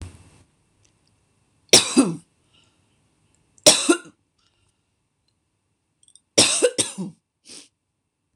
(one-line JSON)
{"three_cough_length": "8.4 s", "three_cough_amplitude": 26028, "three_cough_signal_mean_std_ratio": 0.26, "survey_phase": "beta (2021-08-13 to 2022-03-07)", "age": "45-64", "gender": "Female", "wearing_mask": "No", "symptom_cough_any": true, "symptom_runny_or_blocked_nose": true, "symptom_headache": true, "smoker_status": "Never smoked", "respiratory_condition_asthma": true, "respiratory_condition_other": false, "recruitment_source": "Test and Trace", "submission_delay": "1 day", "covid_test_result": "Positive", "covid_test_method": "RT-qPCR", "covid_ct_value": 29.5, "covid_ct_gene": "N gene"}